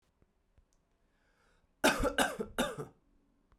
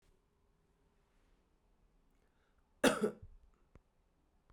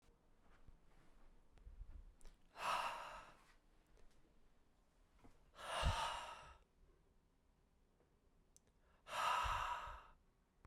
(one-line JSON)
{"three_cough_length": "3.6 s", "three_cough_amplitude": 7827, "three_cough_signal_mean_std_ratio": 0.34, "cough_length": "4.5 s", "cough_amplitude": 5636, "cough_signal_mean_std_ratio": 0.2, "exhalation_length": "10.7 s", "exhalation_amplitude": 1611, "exhalation_signal_mean_std_ratio": 0.44, "survey_phase": "beta (2021-08-13 to 2022-03-07)", "age": "18-44", "gender": "Male", "wearing_mask": "No", "symptom_cough_any": true, "symptom_runny_or_blocked_nose": true, "symptom_change_to_sense_of_smell_or_taste": true, "symptom_onset": "5 days", "smoker_status": "Never smoked", "respiratory_condition_asthma": false, "respiratory_condition_other": false, "recruitment_source": "Test and Trace", "submission_delay": "2 days", "covid_test_result": "Positive", "covid_test_method": "RT-qPCR", "covid_ct_value": 20.3, "covid_ct_gene": "ORF1ab gene", "covid_ct_mean": 20.5, "covid_viral_load": "190000 copies/ml", "covid_viral_load_category": "Low viral load (10K-1M copies/ml)"}